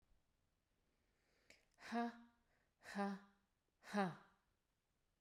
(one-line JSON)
{"exhalation_length": "5.2 s", "exhalation_amplitude": 1298, "exhalation_signal_mean_std_ratio": 0.33, "survey_phase": "beta (2021-08-13 to 2022-03-07)", "age": "18-44", "gender": "Female", "wearing_mask": "No", "symptom_none": true, "smoker_status": "Never smoked", "respiratory_condition_asthma": false, "respiratory_condition_other": false, "recruitment_source": "REACT", "submission_delay": "0 days", "covid_test_result": "Negative", "covid_test_method": "RT-qPCR"}